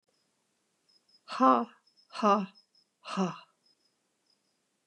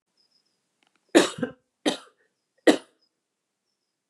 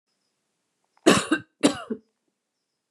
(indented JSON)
{
  "exhalation_length": "4.9 s",
  "exhalation_amplitude": 9924,
  "exhalation_signal_mean_std_ratio": 0.29,
  "three_cough_length": "4.1 s",
  "three_cough_amplitude": 25681,
  "three_cough_signal_mean_std_ratio": 0.21,
  "cough_length": "2.9 s",
  "cough_amplitude": 26858,
  "cough_signal_mean_std_ratio": 0.27,
  "survey_phase": "beta (2021-08-13 to 2022-03-07)",
  "age": "65+",
  "gender": "Female",
  "wearing_mask": "No",
  "symptom_none": true,
  "smoker_status": "Never smoked",
  "respiratory_condition_asthma": false,
  "respiratory_condition_other": false,
  "recruitment_source": "REACT",
  "submission_delay": "1 day",
  "covid_test_result": "Negative",
  "covid_test_method": "RT-qPCR",
  "influenza_a_test_result": "Negative",
  "influenza_b_test_result": "Negative"
}